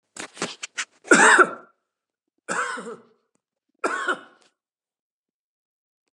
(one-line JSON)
{"cough_length": "6.1 s", "cough_amplitude": 29448, "cough_signal_mean_std_ratio": 0.29, "survey_phase": "beta (2021-08-13 to 2022-03-07)", "age": "65+", "gender": "Male", "wearing_mask": "No", "symptom_cough_any": true, "symptom_runny_or_blocked_nose": true, "smoker_status": "Ex-smoker", "respiratory_condition_asthma": false, "respiratory_condition_other": false, "recruitment_source": "REACT", "submission_delay": "2 days", "covid_test_result": "Negative", "covid_test_method": "RT-qPCR", "influenza_a_test_result": "Negative", "influenza_b_test_result": "Negative"}